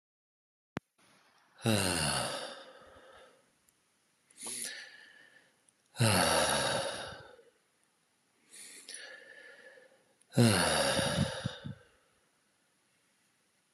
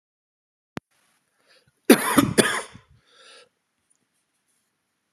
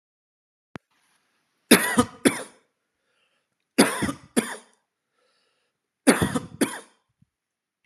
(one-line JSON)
{"exhalation_length": "13.7 s", "exhalation_amplitude": 6810, "exhalation_signal_mean_std_ratio": 0.41, "cough_length": "5.1 s", "cough_amplitude": 32040, "cough_signal_mean_std_ratio": 0.23, "three_cough_length": "7.9 s", "three_cough_amplitude": 31755, "three_cough_signal_mean_std_ratio": 0.28, "survey_phase": "beta (2021-08-13 to 2022-03-07)", "age": "45-64", "gender": "Male", "wearing_mask": "No", "symptom_none": true, "smoker_status": "Never smoked", "respiratory_condition_asthma": false, "respiratory_condition_other": false, "recruitment_source": "REACT", "submission_delay": "10 days", "covid_test_result": "Negative", "covid_test_method": "RT-qPCR", "influenza_a_test_result": "Unknown/Void", "influenza_b_test_result": "Unknown/Void"}